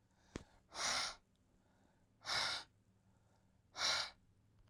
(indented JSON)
{
  "exhalation_length": "4.7 s",
  "exhalation_amplitude": 1866,
  "exhalation_signal_mean_std_ratio": 0.42,
  "survey_phase": "beta (2021-08-13 to 2022-03-07)",
  "age": "18-44",
  "gender": "Male",
  "wearing_mask": "No",
  "symptom_cough_any": true,
  "symptom_change_to_sense_of_smell_or_taste": true,
  "symptom_onset": "3 days",
  "smoker_status": "Never smoked",
  "respiratory_condition_asthma": false,
  "respiratory_condition_other": false,
  "recruitment_source": "Test and Trace",
  "submission_delay": "2 days",
  "covid_test_result": "Positive",
  "covid_test_method": "RT-qPCR",
  "covid_ct_value": 18.7,
  "covid_ct_gene": "ORF1ab gene",
  "covid_ct_mean": 19.5,
  "covid_viral_load": "390000 copies/ml",
  "covid_viral_load_category": "Low viral load (10K-1M copies/ml)"
}